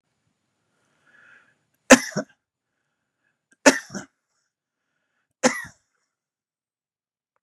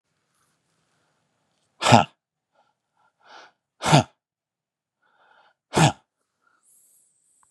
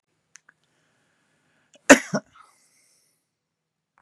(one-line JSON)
{"three_cough_length": "7.4 s", "three_cough_amplitude": 32768, "three_cough_signal_mean_std_ratio": 0.15, "exhalation_length": "7.5 s", "exhalation_amplitude": 32767, "exhalation_signal_mean_std_ratio": 0.2, "cough_length": "4.0 s", "cough_amplitude": 32768, "cough_signal_mean_std_ratio": 0.13, "survey_phase": "beta (2021-08-13 to 2022-03-07)", "age": "65+", "gender": "Male", "wearing_mask": "No", "symptom_none": true, "smoker_status": "Ex-smoker", "respiratory_condition_asthma": false, "respiratory_condition_other": true, "recruitment_source": "REACT", "submission_delay": "7 days", "covid_test_result": "Negative", "covid_test_method": "RT-qPCR", "influenza_a_test_result": "Negative", "influenza_b_test_result": "Negative"}